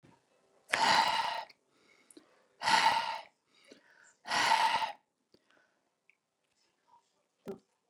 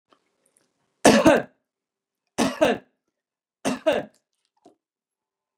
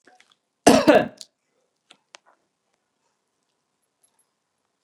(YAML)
exhalation_length: 7.9 s
exhalation_amplitude: 13466
exhalation_signal_mean_std_ratio: 0.38
three_cough_length: 5.6 s
three_cough_amplitude: 27236
three_cough_signal_mean_std_ratio: 0.29
cough_length: 4.8 s
cough_amplitude: 32767
cough_signal_mean_std_ratio: 0.2
survey_phase: beta (2021-08-13 to 2022-03-07)
age: 65+
gender: Male
wearing_mask: 'No'
symptom_none: true
smoker_status: Never smoked
respiratory_condition_asthma: false
respiratory_condition_other: false
recruitment_source: REACT
submission_delay: 1 day
covid_test_result: Negative
covid_test_method: RT-qPCR